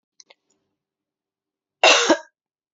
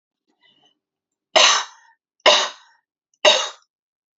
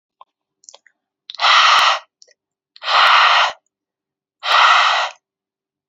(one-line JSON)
{"cough_length": "2.7 s", "cough_amplitude": 30052, "cough_signal_mean_std_ratio": 0.26, "three_cough_length": "4.2 s", "three_cough_amplitude": 32326, "three_cough_signal_mean_std_ratio": 0.32, "exhalation_length": "5.9 s", "exhalation_amplitude": 32767, "exhalation_signal_mean_std_ratio": 0.49, "survey_phase": "alpha (2021-03-01 to 2021-08-12)", "age": "18-44", "gender": "Female", "wearing_mask": "No", "symptom_none": true, "smoker_status": "Never smoked", "respiratory_condition_asthma": false, "respiratory_condition_other": false, "recruitment_source": "Test and Trace", "submission_delay": "4 days", "covid_test_result": "Positive", "covid_test_method": "RT-qPCR", "covid_ct_value": 36.2, "covid_ct_gene": "N gene"}